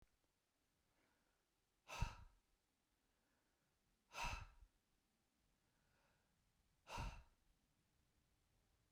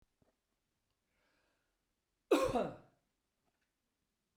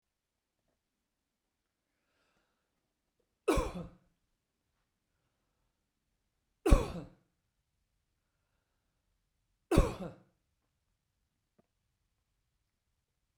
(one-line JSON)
{"exhalation_length": "8.9 s", "exhalation_amplitude": 1059, "exhalation_signal_mean_std_ratio": 0.27, "cough_length": "4.4 s", "cough_amplitude": 3740, "cough_signal_mean_std_ratio": 0.23, "three_cough_length": "13.4 s", "three_cough_amplitude": 12972, "three_cough_signal_mean_std_ratio": 0.16, "survey_phase": "beta (2021-08-13 to 2022-03-07)", "age": "45-64", "gender": "Male", "wearing_mask": "No", "symptom_none": true, "smoker_status": "Ex-smoker", "respiratory_condition_asthma": false, "respiratory_condition_other": false, "recruitment_source": "REACT", "submission_delay": "2 days", "covid_test_result": "Negative", "covid_test_method": "RT-qPCR"}